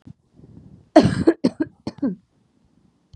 cough_length: 3.2 s
cough_amplitude: 32768
cough_signal_mean_std_ratio: 0.3
survey_phase: beta (2021-08-13 to 2022-03-07)
age: 18-44
gender: Female
wearing_mask: 'No'
symptom_sore_throat: true
symptom_fatigue: true
symptom_headache: true
symptom_change_to_sense_of_smell_or_taste: true
smoker_status: Ex-smoker
respiratory_condition_asthma: false
respiratory_condition_other: false
recruitment_source: Test and Trace
submission_delay: 1 day
covid_test_result: Positive
covid_test_method: LFT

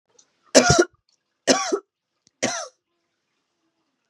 three_cough_length: 4.1 s
three_cough_amplitude: 32594
three_cough_signal_mean_std_ratio: 0.3
survey_phase: beta (2021-08-13 to 2022-03-07)
age: 18-44
gender: Female
wearing_mask: 'No'
symptom_fatigue: true
symptom_headache: true
symptom_onset: 12 days
smoker_status: Ex-smoker
respiratory_condition_asthma: false
respiratory_condition_other: false
recruitment_source: REACT
submission_delay: 1 day
covid_test_result: Negative
covid_test_method: RT-qPCR
influenza_a_test_result: Negative
influenza_b_test_result: Negative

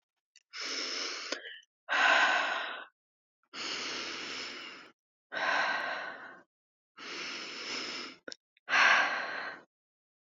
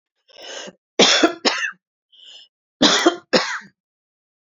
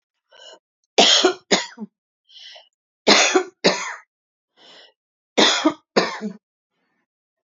exhalation_length: 10.2 s
exhalation_amplitude: 8520
exhalation_signal_mean_std_ratio: 0.53
cough_length: 4.4 s
cough_amplitude: 29936
cough_signal_mean_std_ratio: 0.39
three_cough_length: 7.6 s
three_cough_amplitude: 32768
three_cough_signal_mean_std_ratio: 0.36
survey_phase: beta (2021-08-13 to 2022-03-07)
age: 45-64
gender: Female
wearing_mask: 'No'
symptom_none: true
smoker_status: Ex-smoker
respiratory_condition_asthma: false
respiratory_condition_other: false
recruitment_source: REACT
submission_delay: 1 day
covid_test_result: Negative
covid_test_method: RT-qPCR
influenza_a_test_result: Negative
influenza_b_test_result: Negative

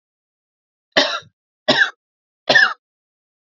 three_cough_length: 3.6 s
three_cough_amplitude: 31511
three_cough_signal_mean_std_ratio: 0.32
survey_phase: alpha (2021-03-01 to 2021-08-12)
age: 18-44
gender: Female
wearing_mask: 'No'
symptom_none: true
symptom_onset: 6 days
smoker_status: Ex-smoker
respiratory_condition_asthma: false
respiratory_condition_other: false
recruitment_source: REACT
submission_delay: 1 day
covid_test_result: Negative
covid_test_method: RT-qPCR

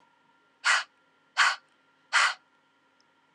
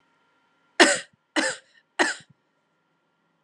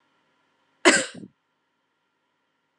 exhalation_length: 3.3 s
exhalation_amplitude: 10550
exhalation_signal_mean_std_ratio: 0.33
three_cough_length: 3.4 s
three_cough_amplitude: 32767
three_cough_signal_mean_std_ratio: 0.27
cough_length: 2.8 s
cough_amplitude: 31028
cough_signal_mean_std_ratio: 0.2
survey_phase: beta (2021-08-13 to 2022-03-07)
age: 18-44
gender: Female
wearing_mask: 'No'
symptom_none: true
smoker_status: Never smoked
respiratory_condition_asthma: false
respiratory_condition_other: false
recruitment_source: REACT
submission_delay: 3 days
covid_test_result: Negative
covid_test_method: RT-qPCR
influenza_a_test_result: Unknown/Void
influenza_b_test_result: Unknown/Void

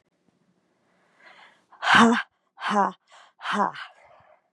exhalation_length: 4.5 s
exhalation_amplitude: 22772
exhalation_signal_mean_std_ratio: 0.34
survey_phase: beta (2021-08-13 to 2022-03-07)
age: 18-44
gender: Female
wearing_mask: 'No'
symptom_cough_any: true
symptom_runny_or_blocked_nose: true
symptom_shortness_of_breath: true
symptom_change_to_sense_of_smell_or_taste: true
symptom_loss_of_taste: true
symptom_onset: 2 days
smoker_status: Ex-smoker
respiratory_condition_asthma: false
respiratory_condition_other: false
recruitment_source: Test and Trace
submission_delay: 1 day
covid_test_result: Positive
covid_test_method: RT-qPCR
covid_ct_value: 21.0
covid_ct_gene: N gene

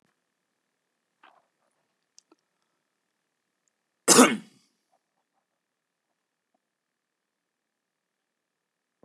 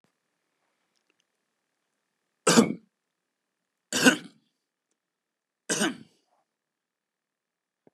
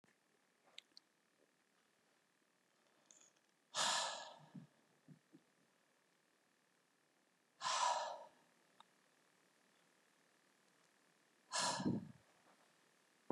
cough_length: 9.0 s
cough_amplitude: 25951
cough_signal_mean_std_ratio: 0.13
three_cough_length: 7.9 s
three_cough_amplitude: 19739
three_cough_signal_mean_std_ratio: 0.21
exhalation_length: 13.3 s
exhalation_amplitude: 1748
exhalation_signal_mean_std_ratio: 0.31
survey_phase: beta (2021-08-13 to 2022-03-07)
age: 45-64
gender: Male
wearing_mask: 'No'
symptom_none: true
smoker_status: Current smoker (11 or more cigarettes per day)
respiratory_condition_asthma: false
respiratory_condition_other: false
recruitment_source: REACT
submission_delay: 1 day
covid_test_result: Negative
covid_test_method: RT-qPCR
influenza_a_test_result: Negative
influenza_b_test_result: Negative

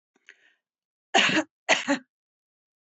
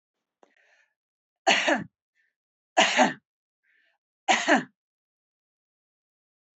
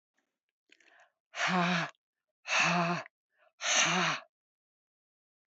cough_length: 3.0 s
cough_amplitude: 19135
cough_signal_mean_std_ratio: 0.32
three_cough_length: 6.6 s
three_cough_amplitude: 16593
three_cough_signal_mean_std_ratio: 0.29
exhalation_length: 5.5 s
exhalation_amplitude: 6559
exhalation_signal_mean_std_ratio: 0.45
survey_phase: beta (2021-08-13 to 2022-03-07)
age: 65+
gender: Female
wearing_mask: 'No'
symptom_cough_any: true
smoker_status: Never smoked
respiratory_condition_asthma: false
respiratory_condition_other: false
recruitment_source: REACT
submission_delay: 2 days
covid_test_result: Negative
covid_test_method: RT-qPCR
influenza_a_test_result: Negative
influenza_b_test_result: Negative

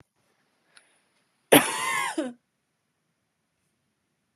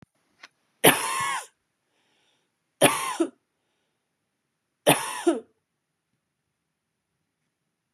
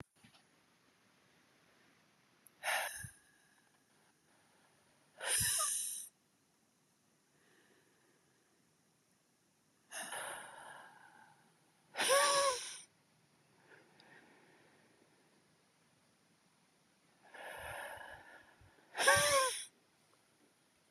cough_length: 4.4 s
cough_amplitude: 30514
cough_signal_mean_std_ratio: 0.24
three_cough_length: 7.9 s
three_cough_amplitude: 30782
three_cough_signal_mean_std_ratio: 0.27
exhalation_length: 20.9 s
exhalation_amplitude: 6410
exhalation_signal_mean_std_ratio: 0.32
survey_phase: beta (2021-08-13 to 2022-03-07)
age: 18-44
gender: Female
wearing_mask: 'No'
symptom_cough_any: true
symptom_runny_or_blocked_nose: true
symptom_fatigue: true
symptom_fever_high_temperature: true
symptom_headache: true
symptom_onset: 3 days
smoker_status: Ex-smoker
respiratory_condition_asthma: false
respiratory_condition_other: false
recruitment_source: Test and Trace
submission_delay: 1 day
covid_test_result: Negative
covid_test_method: RT-qPCR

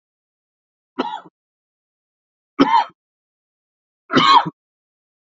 three_cough_length: 5.3 s
three_cough_amplitude: 32768
three_cough_signal_mean_std_ratio: 0.28
survey_phase: beta (2021-08-13 to 2022-03-07)
age: 45-64
gender: Male
wearing_mask: 'No'
symptom_cough_any: true
symptom_new_continuous_cough: true
symptom_runny_or_blocked_nose: true
symptom_sore_throat: true
symptom_fatigue: true
symptom_headache: true
symptom_change_to_sense_of_smell_or_taste: true
symptom_loss_of_taste: true
symptom_other: true
smoker_status: Ex-smoker
respiratory_condition_asthma: false
respiratory_condition_other: true
recruitment_source: Test and Trace
submission_delay: 0 days
covid_test_result: Positive
covid_test_method: LFT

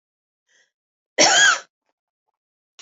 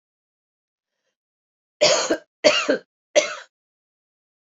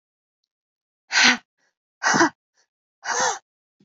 cough_length: 2.8 s
cough_amplitude: 28377
cough_signal_mean_std_ratio: 0.31
three_cough_length: 4.4 s
three_cough_amplitude: 27273
three_cough_signal_mean_std_ratio: 0.32
exhalation_length: 3.8 s
exhalation_amplitude: 24988
exhalation_signal_mean_std_ratio: 0.35
survey_phase: beta (2021-08-13 to 2022-03-07)
age: 45-64
gender: Female
wearing_mask: 'No'
symptom_fatigue: true
symptom_onset: 12 days
smoker_status: Ex-smoker
respiratory_condition_asthma: false
respiratory_condition_other: false
recruitment_source: REACT
submission_delay: 1 day
covid_test_result: Negative
covid_test_method: RT-qPCR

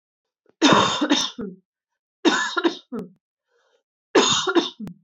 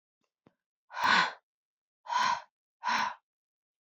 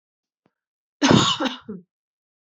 three_cough_length: 5.0 s
three_cough_amplitude: 26809
three_cough_signal_mean_std_ratio: 0.47
exhalation_length: 3.9 s
exhalation_amplitude: 7473
exhalation_signal_mean_std_ratio: 0.39
cough_length: 2.6 s
cough_amplitude: 26329
cough_signal_mean_std_ratio: 0.33
survey_phase: beta (2021-08-13 to 2022-03-07)
age: 18-44
gender: Female
wearing_mask: 'No'
symptom_cough_any: true
symptom_runny_or_blocked_nose: true
symptom_fatigue: true
symptom_fever_high_temperature: true
symptom_change_to_sense_of_smell_or_taste: true
symptom_onset: 5 days
smoker_status: Never smoked
respiratory_condition_asthma: false
respiratory_condition_other: false
recruitment_source: Test and Trace
submission_delay: 3 days
covid_test_result: Positive
covid_test_method: RT-qPCR
covid_ct_value: 23.1
covid_ct_gene: N gene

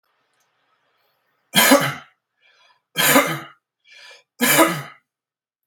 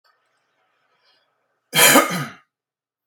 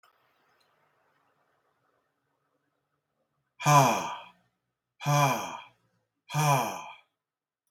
three_cough_length: 5.7 s
three_cough_amplitude: 32768
three_cough_signal_mean_std_ratio: 0.35
cough_length: 3.1 s
cough_amplitude: 32727
cough_signal_mean_std_ratio: 0.29
exhalation_length: 7.7 s
exhalation_amplitude: 13910
exhalation_signal_mean_std_ratio: 0.33
survey_phase: beta (2021-08-13 to 2022-03-07)
age: 45-64
gender: Male
wearing_mask: 'No'
symptom_none: true
smoker_status: Current smoker (11 or more cigarettes per day)
respiratory_condition_asthma: false
respiratory_condition_other: false
recruitment_source: REACT
submission_delay: 1 day
covid_test_result: Negative
covid_test_method: RT-qPCR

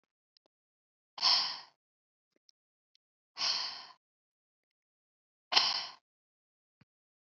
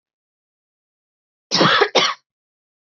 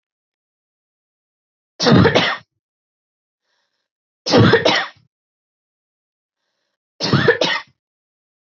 exhalation_length: 7.3 s
exhalation_amplitude: 12824
exhalation_signal_mean_std_ratio: 0.27
cough_length: 2.9 s
cough_amplitude: 27596
cough_signal_mean_std_ratio: 0.34
three_cough_length: 8.5 s
three_cough_amplitude: 31690
three_cough_signal_mean_std_ratio: 0.33
survey_phase: beta (2021-08-13 to 2022-03-07)
age: 18-44
gender: Female
wearing_mask: 'No'
symptom_cough_any: true
symptom_shortness_of_breath: true
symptom_headache: true
symptom_onset: 4 days
smoker_status: Never smoked
respiratory_condition_asthma: false
respiratory_condition_other: false
recruitment_source: Test and Trace
submission_delay: 2 days
covid_test_result: Positive
covid_test_method: RT-qPCR
covid_ct_value: 22.3
covid_ct_gene: ORF1ab gene
covid_ct_mean: 22.9
covid_viral_load: 30000 copies/ml
covid_viral_load_category: Low viral load (10K-1M copies/ml)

